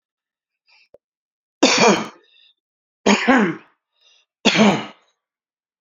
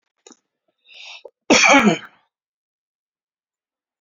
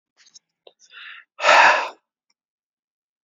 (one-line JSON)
{"three_cough_length": "5.8 s", "three_cough_amplitude": 31476, "three_cough_signal_mean_std_ratio": 0.36, "cough_length": "4.0 s", "cough_amplitude": 29363, "cough_signal_mean_std_ratio": 0.28, "exhalation_length": "3.2 s", "exhalation_amplitude": 27917, "exhalation_signal_mean_std_ratio": 0.3, "survey_phase": "beta (2021-08-13 to 2022-03-07)", "age": "45-64", "gender": "Male", "wearing_mask": "No", "symptom_none": true, "smoker_status": "Ex-smoker", "respiratory_condition_asthma": false, "respiratory_condition_other": false, "recruitment_source": "REACT", "submission_delay": "2 days", "covid_test_result": "Negative", "covid_test_method": "RT-qPCR", "influenza_a_test_result": "Negative", "influenza_b_test_result": "Negative"}